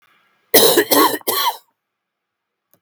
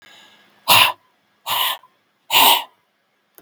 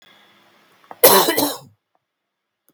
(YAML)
three_cough_length: 2.8 s
three_cough_amplitude: 32767
three_cough_signal_mean_std_ratio: 0.43
exhalation_length: 3.4 s
exhalation_amplitude: 32768
exhalation_signal_mean_std_ratio: 0.38
cough_length: 2.7 s
cough_amplitude: 32768
cough_signal_mean_std_ratio: 0.32
survey_phase: beta (2021-08-13 to 2022-03-07)
age: 45-64
gender: Male
wearing_mask: 'No'
symptom_cough_any: true
symptom_runny_or_blocked_nose: true
symptom_fatigue: true
symptom_fever_high_temperature: true
symptom_headache: true
smoker_status: Never smoked
respiratory_condition_asthma: false
respiratory_condition_other: false
recruitment_source: Test and Trace
submission_delay: 2 days
covid_test_result: Positive
covid_test_method: RT-qPCR
covid_ct_value: 15.6
covid_ct_gene: ORF1ab gene
covid_ct_mean: 15.8
covid_viral_load: 6400000 copies/ml
covid_viral_load_category: High viral load (>1M copies/ml)